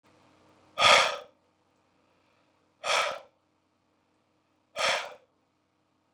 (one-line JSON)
{"exhalation_length": "6.1 s", "exhalation_amplitude": 17775, "exhalation_signal_mean_std_ratio": 0.28, "survey_phase": "beta (2021-08-13 to 2022-03-07)", "age": "45-64", "gender": "Male", "wearing_mask": "No", "symptom_none": true, "smoker_status": "Ex-smoker", "respiratory_condition_asthma": false, "respiratory_condition_other": false, "recruitment_source": "REACT", "submission_delay": "1 day", "covid_test_result": "Negative", "covid_test_method": "RT-qPCR", "influenza_a_test_result": "Negative", "influenza_b_test_result": "Negative"}